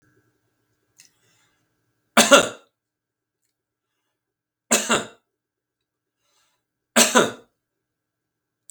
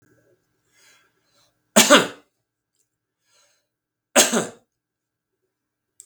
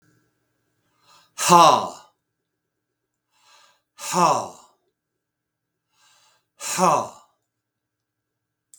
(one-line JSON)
{"three_cough_length": "8.7 s", "three_cough_amplitude": 32766, "three_cough_signal_mean_std_ratio": 0.22, "cough_length": "6.1 s", "cough_amplitude": 32768, "cough_signal_mean_std_ratio": 0.22, "exhalation_length": "8.8 s", "exhalation_amplitude": 32766, "exhalation_signal_mean_std_ratio": 0.27, "survey_phase": "beta (2021-08-13 to 2022-03-07)", "age": "65+", "gender": "Male", "wearing_mask": "No", "symptom_none": true, "smoker_status": "Ex-smoker", "respiratory_condition_asthma": false, "respiratory_condition_other": false, "recruitment_source": "REACT", "submission_delay": "2 days", "covid_test_result": "Negative", "covid_test_method": "RT-qPCR", "influenza_a_test_result": "Negative", "influenza_b_test_result": "Negative"}